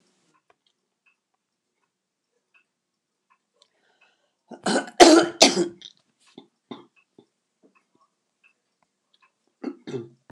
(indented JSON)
{
  "cough_length": "10.3 s",
  "cough_amplitude": 29204,
  "cough_signal_mean_std_ratio": 0.2,
  "survey_phase": "beta (2021-08-13 to 2022-03-07)",
  "age": "65+",
  "gender": "Female",
  "wearing_mask": "No",
  "symptom_cough_any": true,
  "smoker_status": "Never smoked",
  "respiratory_condition_asthma": false,
  "respiratory_condition_other": false,
  "recruitment_source": "REACT",
  "submission_delay": "2 days",
  "covid_test_result": "Negative",
  "covid_test_method": "RT-qPCR",
  "influenza_a_test_result": "Negative",
  "influenza_b_test_result": "Negative"
}